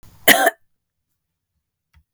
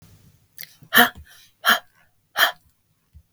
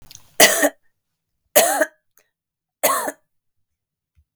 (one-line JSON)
{"cough_length": "2.1 s", "cough_amplitude": 32768, "cough_signal_mean_std_ratio": 0.25, "exhalation_length": "3.3 s", "exhalation_amplitude": 32515, "exhalation_signal_mean_std_ratio": 0.28, "three_cough_length": "4.4 s", "three_cough_amplitude": 32768, "three_cough_signal_mean_std_ratio": 0.32, "survey_phase": "beta (2021-08-13 to 2022-03-07)", "age": "45-64", "gender": "Female", "wearing_mask": "No", "symptom_fatigue": true, "symptom_change_to_sense_of_smell_or_taste": true, "symptom_loss_of_taste": true, "smoker_status": "Ex-smoker", "respiratory_condition_asthma": false, "respiratory_condition_other": false, "recruitment_source": "REACT", "submission_delay": "1 day", "covid_test_result": "Negative", "covid_test_method": "RT-qPCR", "influenza_a_test_result": "Negative", "influenza_b_test_result": "Negative"}